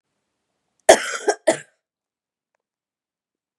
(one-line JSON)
{"cough_length": "3.6 s", "cough_amplitude": 32768, "cough_signal_mean_std_ratio": 0.2, "survey_phase": "beta (2021-08-13 to 2022-03-07)", "age": "18-44", "gender": "Female", "wearing_mask": "No", "symptom_cough_any": true, "symptom_runny_or_blocked_nose": true, "symptom_headache": true, "symptom_onset": "3 days", "smoker_status": "Never smoked", "respiratory_condition_asthma": false, "respiratory_condition_other": false, "recruitment_source": "REACT", "submission_delay": "1 day", "covid_test_result": "Positive", "covid_test_method": "RT-qPCR", "covid_ct_value": 27.0, "covid_ct_gene": "E gene", "influenza_a_test_result": "Negative", "influenza_b_test_result": "Negative"}